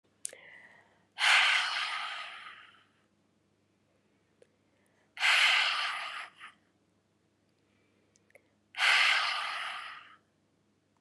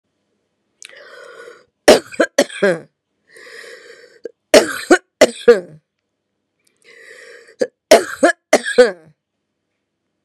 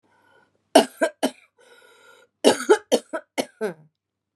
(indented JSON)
{
  "exhalation_length": "11.0 s",
  "exhalation_amplitude": 8854,
  "exhalation_signal_mean_std_ratio": 0.41,
  "three_cough_length": "10.2 s",
  "three_cough_amplitude": 32768,
  "three_cough_signal_mean_std_ratio": 0.29,
  "cough_length": "4.4 s",
  "cough_amplitude": 31915,
  "cough_signal_mean_std_ratio": 0.29,
  "survey_phase": "beta (2021-08-13 to 2022-03-07)",
  "age": "45-64",
  "gender": "Female",
  "wearing_mask": "No",
  "symptom_fatigue": true,
  "symptom_onset": "13 days",
  "smoker_status": "Never smoked",
  "respiratory_condition_asthma": false,
  "respiratory_condition_other": false,
  "recruitment_source": "REACT",
  "submission_delay": "1 day",
  "covid_test_result": "Negative",
  "covid_test_method": "RT-qPCR",
  "influenza_a_test_result": "Negative",
  "influenza_b_test_result": "Negative"
}